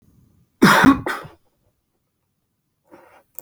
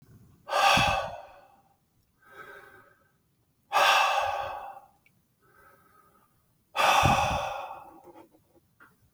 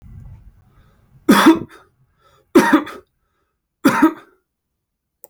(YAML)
cough_length: 3.4 s
cough_amplitude: 29703
cough_signal_mean_std_ratio: 0.29
exhalation_length: 9.1 s
exhalation_amplitude: 12033
exhalation_signal_mean_std_ratio: 0.43
three_cough_length: 5.3 s
three_cough_amplitude: 29099
three_cough_signal_mean_std_ratio: 0.32
survey_phase: beta (2021-08-13 to 2022-03-07)
age: 45-64
gender: Male
wearing_mask: 'No'
symptom_none: true
smoker_status: Ex-smoker
respiratory_condition_asthma: true
respiratory_condition_other: false
recruitment_source: REACT
submission_delay: 1 day
covid_test_result: Negative
covid_test_method: RT-qPCR